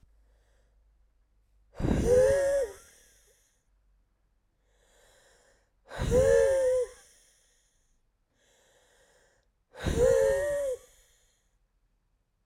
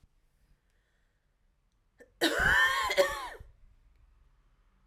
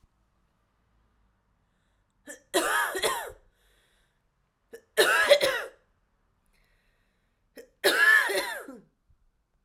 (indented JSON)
{
  "exhalation_length": "12.5 s",
  "exhalation_amplitude": 7793,
  "exhalation_signal_mean_std_ratio": 0.41,
  "cough_length": "4.9 s",
  "cough_amplitude": 10446,
  "cough_signal_mean_std_ratio": 0.38,
  "three_cough_length": "9.6 s",
  "three_cough_amplitude": 15793,
  "three_cough_signal_mean_std_ratio": 0.35,
  "survey_phase": "alpha (2021-03-01 to 2021-08-12)",
  "age": "18-44",
  "gender": "Female",
  "wearing_mask": "No",
  "symptom_cough_any": true,
  "symptom_fatigue": true,
  "symptom_headache": true,
  "symptom_change_to_sense_of_smell_or_taste": true,
  "symptom_onset": "3 days",
  "smoker_status": "Ex-smoker",
  "respiratory_condition_asthma": false,
  "respiratory_condition_other": false,
  "recruitment_source": "Test and Trace",
  "submission_delay": "2 days",
  "covid_test_result": "Positive",
  "covid_test_method": "ePCR"
}